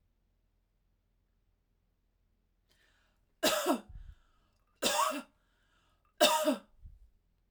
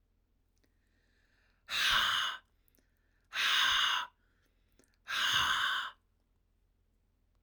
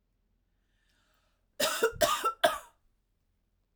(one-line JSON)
{"three_cough_length": "7.5 s", "three_cough_amplitude": 9402, "three_cough_signal_mean_std_ratio": 0.31, "exhalation_length": "7.4 s", "exhalation_amplitude": 4987, "exhalation_signal_mean_std_ratio": 0.47, "cough_length": "3.8 s", "cough_amplitude": 9246, "cough_signal_mean_std_ratio": 0.34, "survey_phase": "alpha (2021-03-01 to 2021-08-12)", "age": "18-44", "gender": "Female", "wearing_mask": "No", "symptom_none": true, "smoker_status": "Ex-smoker", "respiratory_condition_asthma": false, "respiratory_condition_other": false, "recruitment_source": "REACT", "submission_delay": "1 day", "covid_test_result": "Negative", "covid_test_method": "RT-qPCR"}